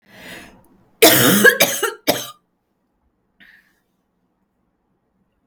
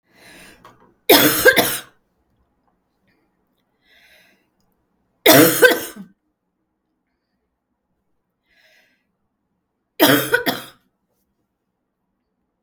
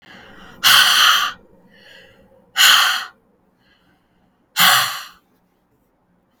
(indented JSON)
{
  "cough_length": "5.5 s",
  "cough_amplitude": 32768,
  "cough_signal_mean_std_ratio": 0.32,
  "three_cough_length": "12.6 s",
  "three_cough_amplitude": 32768,
  "three_cough_signal_mean_std_ratio": 0.27,
  "exhalation_length": "6.4 s",
  "exhalation_amplitude": 32768,
  "exhalation_signal_mean_std_ratio": 0.41,
  "survey_phase": "beta (2021-08-13 to 2022-03-07)",
  "age": "18-44",
  "gender": "Female",
  "wearing_mask": "No",
  "symptom_runny_or_blocked_nose": true,
  "smoker_status": "Never smoked",
  "respiratory_condition_asthma": true,
  "respiratory_condition_other": false,
  "recruitment_source": "REACT",
  "submission_delay": "1 day",
  "covid_test_result": "Negative",
  "covid_test_method": "RT-qPCR",
  "influenza_a_test_result": "Negative",
  "influenza_b_test_result": "Negative"
}